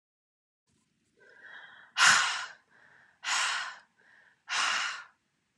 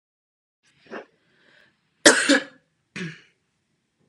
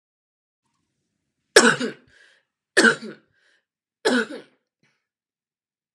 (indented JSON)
{
  "exhalation_length": "5.6 s",
  "exhalation_amplitude": 12304,
  "exhalation_signal_mean_std_ratio": 0.38,
  "cough_length": "4.1 s",
  "cough_amplitude": 32767,
  "cough_signal_mean_std_ratio": 0.23,
  "three_cough_length": "5.9 s",
  "three_cough_amplitude": 32767,
  "three_cough_signal_mean_std_ratio": 0.25,
  "survey_phase": "beta (2021-08-13 to 2022-03-07)",
  "age": "18-44",
  "gender": "Female",
  "wearing_mask": "No",
  "symptom_cough_any": true,
  "symptom_runny_or_blocked_nose": true,
  "symptom_onset": "3 days",
  "smoker_status": "Never smoked",
  "respiratory_condition_asthma": false,
  "respiratory_condition_other": false,
  "recruitment_source": "Test and Trace",
  "submission_delay": "1 day",
  "covid_test_result": "Positive",
  "covid_test_method": "ePCR"
}